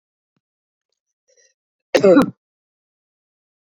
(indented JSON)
{
  "cough_length": "3.8 s",
  "cough_amplitude": 28161,
  "cough_signal_mean_std_ratio": 0.23,
  "survey_phase": "beta (2021-08-13 to 2022-03-07)",
  "age": "65+",
  "gender": "Female",
  "wearing_mask": "No",
  "symptom_none": true,
  "smoker_status": "Ex-smoker",
  "respiratory_condition_asthma": false,
  "respiratory_condition_other": false,
  "recruitment_source": "REACT",
  "submission_delay": "1 day",
  "covid_test_result": "Negative",
  "covid_test_method": "RT-qPCR"
}